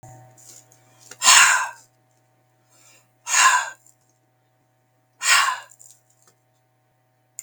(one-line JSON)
{"exhalation_length": "7.4 s", "exhalation_amplitude": 32766, "exhalation_signal_mean_std_ratio": 0.31, "survey_phase": "beta (2021-08-13 to 2022-03-07)", "age": "45-64", "gender": "Male", "wearing_mask": "No", "symptom_runny_or_blocked_nose": true, "smoker_status": "Never smoked", "respiratory_condition_asthma": false, "respiratory_condition_other": false, "recruitment_source": "REACT", "submission_delay": "1 day", "covid_test_result": "Negative", "covid_test_method": "RT-qPCR"}